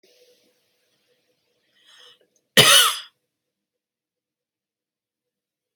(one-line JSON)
{"cough_length": "5.8 s", "cough_amplitude": 30183, "cough_signal_mean_std_ratio": 0.2, "survey_phase": "alpha (2021-03-01 to 2021-08-12)", "age": "45-64", "gender": "Female", "wearing_mask": "No", "symptom_none": true, "smoker_status": "Never smoked", "respiratory_condition_asthma": false, "respiratory_condition_other": false, "recruitment_source": "REACT", "submission_delay": "2 days", "covid_test_result": "Negative", "covid_test_method": "RT-qPCR"}